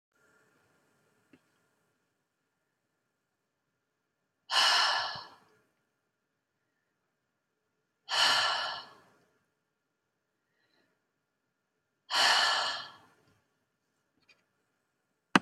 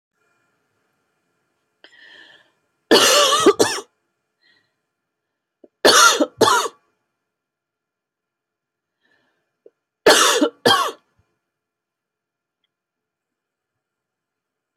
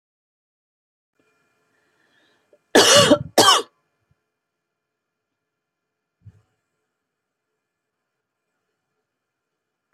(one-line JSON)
{"exhalation_length": "15.4 s", "exhalation_amplitude": 19013, "exhalation_signal_mean_std_ratio": 0.28, "three_cough_length": "14.8 s", "three_cough_amplitude": 32768, "three_cough_signal_mean_std_ratio": 0.3, "cough_length": "9.9 s", "cough_amplitude": 30733, "cough_signal_mean_std_ratio": 0.21, "survey_phase": "beta (2021-08-13 to 2022-03-07)", "age": "45-64", "gender": "Female", "wearing_mask": "No", "symptom_cough_any": true, "symptom_onset": "22 days", "smoker_status": "Never smoked", "respiratory_condition_asthma": false, "respiratory_condition_other": false, "recruitment_source": "Test and Trace", "submission_delay": "1 day", "covid_test_method": "RT-qPCR", "covid_ct_value": 31.9, "covid_ct_gene": "ORF1ab gene", "covid_ct_mean": 32.1, "covid_viral_load": "31 copies/ml", "covid_viral_load_category": "Minimal viral load (< 10K copies/ml)"}